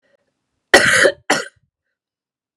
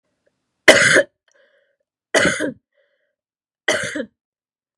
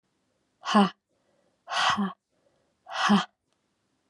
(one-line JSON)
{"cough_length": "2.6 s", "cough_amplitude": 32768, "cough_signal_mean_std_ratio": 0.34, "three_cough_length": "4.8 s", "three_cough_amplitude": 32768, "three_cough_signal_mean_std_ratio": 0.32, "exhalation_length": "4.1 s", "exhalation_amplitude": 13768, "exhalation_signal_mean_std_ratio": 0.36, "survey_phase": "beta (2021-08-13 to 2022-03-07)", "age": "18-44", "gender": "Female", "wearing_mask": "No", "symptom_cough_any": true, "symptom_runny_or_blocked_nose": true, "symptom_onset": "3 days", "smoker_status": "Never smoked", "respiratory_condition_asthma": false, "respiratory_condition_other": false, "recruitment_source": "REACT", "submission_delay": "1 day", "covid_test_result": "Negative", "covid_test_method": "RT-qPCR", "influenza_a_test_result": "Negative", "influenza_b_test_result": "Negative"}